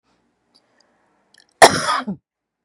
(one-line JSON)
{"cough_length": "2.6 s", "cough_amplitude": 32768, "cough_signal_mean_std_ratio": 0.24, "survey_phase": "beta (2021-08-13 to 2022-03-07)", "age": "45-64", "gender": "Female", "wearing_mask": "No", "symptom_cough_any": true, "symptom_fatigue": true, "symptom_change_to_sense_of_smell_or_taste": true, "symptom_loss_of_taste": true, "symptom_onset": "10 days", "smoker_status": "Never smoked", "respiratory_condition_asthma": false, "respiratory_condition_other": false, "recruitment_source": "REACT", "submission_delay": "3 days", "covid_test_result": "Positive", "covid_test_method": "RT-qPCR", "covid_ct_value": 28.0, "covid_ct_gene": "E gene", "influenza_a_test_result": "Negative", "influenza_b_test_result": "Negative"}